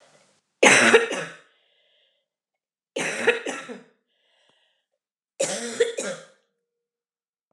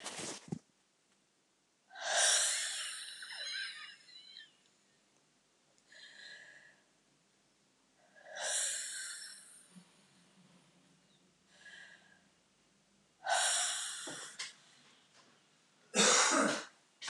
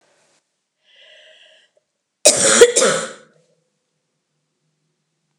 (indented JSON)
{
  "three_cough_length": "7.5 s",
  "three_cough_amplitude": 28286,
  "three_cough_signal_mean_std_ratio": 0.32,
  "exhalation_length": "17.1 s",
  "exhalation_amplitude": 5875,
  "exhalation_signal_mean_std_ratio": 0.4,
  "cough_length": "5.4 s",
  "cough_amplitude": 32768,
  "cough_signal_mean_std_ratio": 0.28,
  "survey_phase": "beta (2021-08-13 to 2022-03-07)",
  "age": "45-64",
  "gender": "Female",
  "wearing_mask": "No",
  "symptom_cough_any": true,
  "symptom_headache": true,
  "symptom_other": true,
  "symptom_onset": "4 days",
  "smoker_status": "Never smoked",
  "respiratory_condition_asthma": false,
  "respiratory_condition_other": false,
  "recruitment_source": "Test and Trace",
  "submission_delay": "2 days",
  "covid_test_result": "Positive",
  "covid_test_method": "RT-qPCR"
}